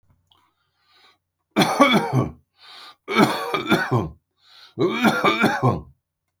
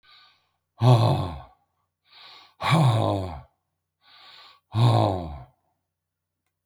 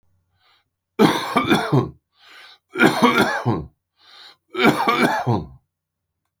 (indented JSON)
{
  "cough_length": "6.4 s",
  "cough_amplitude": 28746,
  "cough_signal_mean_std_ratio": 0.51,
  "exhalation_length": "6.7 s",
  "exhalation_amplitude": 18791,
  "exhalation_signal_mean_std_ratio": 0.42,
  "three_cough_length": "6.4 s",
  "three_cough_amplitude": 27649,
  "three_cough_signal_mean_std_ratio": 0.49,
  "survey_phase": "alpha (2021-03-01 to 2021-08-12)",
  "age": "65+",
  "gender": "Male",
  "wearing_mask": "No",
  "symptom_none": true,
  "smoker_status": "Ex-smoker",
  "respiratory_condition_asthma": false,
  "respiratory_condition_other": false,
  "recruitment_source": "REACT",
  "submission_delay": "3 days",
  "covid_test_result": "Negative",
  "covid_test_method": "RT-qPCR"
}